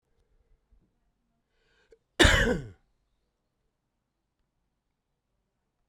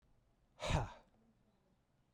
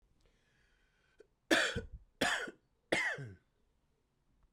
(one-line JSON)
{"cough_length": "5.9 s", "cough_amplitude": 22059, "cough_signal_mean_std_ratio": 0.2, "exhalation_length": "2.1 s", "exhalation_amplitude": 2796, "exhalation_signal_mean_std_ratio": 0.3, "three_cough_length": "4.5 s", "three_cough_amplitude": 5644, "three_cough_signal_mean_std_ratio": 0.35, "survey_phase": "beta (2021-08-13 to 2022-03-07)", "age": "45-64", "gender": "Male", "wearing_mask": "No", "symptom_cough_any": true, "symptom_runny_or_blocked_nose": true, "symptom_shortness_of_breath": true, "symptom_sore_throat": true, "symptom_fatigue": true, "symptom_fever_high_temperature": true, "symptom_headache": true, "symptom_change_to_sense_of_smell_or_taste": true, "symptom_loss_of_taste": true, "symptom_onset": "4 days", "smoker_status": "Ex-smoker", "respiratory_condition_asthma": false, "respiratory_condition_other": false, "recruitment_source": "Test and Trace", "submission_delay": "2 days", "covid_test_result": "Positive", "covid_test_method": "RT-qPCR"}